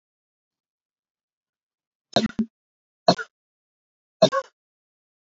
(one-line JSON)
{"three_cough_length": "5.4 s", "three_cough_amplitude": 24337, "three_cough_signal_mean_std_ratio": 0.19, "survey_phase": "beta (2021-08-13 to 2022-03-07)", "age": "18-44", "gender": "Female", "wearing_mask": "No", "symptom_sore_throat": true, "symptom_diarrhoea": true, "symptom_fatigue": true, "symptom_fever_high_temperature": true, "symptom_onset": "3 days", "smoker_status": "Never smoked", "respiratory_condition_asthma": false, "respiratory_condition_other": false, "recruitment_source": "Test and Trace", "submission_delay": "1 day", "covid_test_result": "Positive", "covid_test_method": "RT-qPCR", "covid_ct_value": 35.5, "covid_ct_gene": "N gene"}